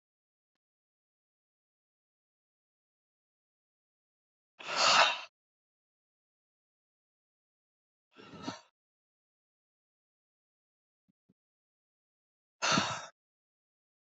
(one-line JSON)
{"exhalation_length": "14.1 s", "exhalation_amplitude": 9256, "exhalation_signal_mean_std_ratio": 0.19, "survey_phase": "beta (2021-08-13 to 2022-03-07)", "age": "45-64", "gender": "Female", "wearing_mask": "No", "symptom_cough_any": true, "symptom_fatigue": true, "symptom_headache": true, "symptom_change_to_sense_of_smell_or_taste": true, "symptom_onset": "4 days", "smoker_status": "Never smoked", "respiratory_condition_asthma": false, "respiratory_condition_other": false, "recruitment_source": "Test and Trace", "submission_delay": "2 days", "covid_test_result": "Positive", "covid_test_method": "RT-qPCR"}